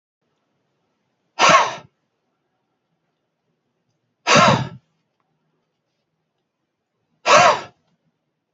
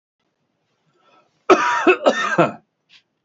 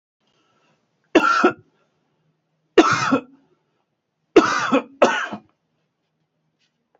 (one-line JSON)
{"exhalation_length": "8.5 s", "exhalation_amplitude": 30466, "exhalation_signal_mean_std_ratio": 0.27, "cough_length": "3.2 s", "cough_amplitude": 29035, "cough_signal_mean_std_ratio": 0.38, "three_cough_length": "7.0 s", "three_cough_amplitude": 27992, "three_cough_signal_mean_std_ratio": 0.33, "survey_phase": "beta (2021-08-13 to 2022-03-07)", "age": "45-64", "gender": "Male", "wearing_mask": "No", "symptom_cough_any": true, "symptom_runny_or_blocked_nose": true, "symptom_diarrhoea": true, "symptom_fatigue": true, "smoker_status": "Never smoked", "respiratory_condition_asthma": true, "respiratory_condition_other": false, "recruitment_source": "Test and Trace", "submission_delay": "4 days", "covid_test_result": "Negative", "covid_test_method": "RT-qPCR"}